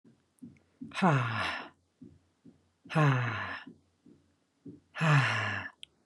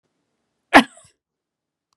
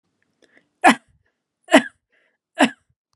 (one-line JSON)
{"exhalation_length": "6.1 s", "exhalation_amplitude": 7475, "exhalation_signal_mean_std_ratio": 0.47, "cough_length": "2.0 s", "cough_amplitude": 32768, "cough_signal_mean_std_ratio": 0.16, "three_cough_length": "3.2 s", "three_cough_amplitude": 32767, "three_cough_signal_mean_std_ratio": 0.23, "survey_phase": "beta (2021-08-13 to 2022-03-07)", "age": "18-44", "gender": "Female", "wearing_mask": "No", "symptom_none": true, "smoker_status": "Never smoked", "respiratory_condition_asthma": false, "respiratory_condition_other": false, "recruitment_source": "REACT", "submission_delay": "1 day", "covid_test_result": "Negative", "covid_test_method": "RT-qPCR"}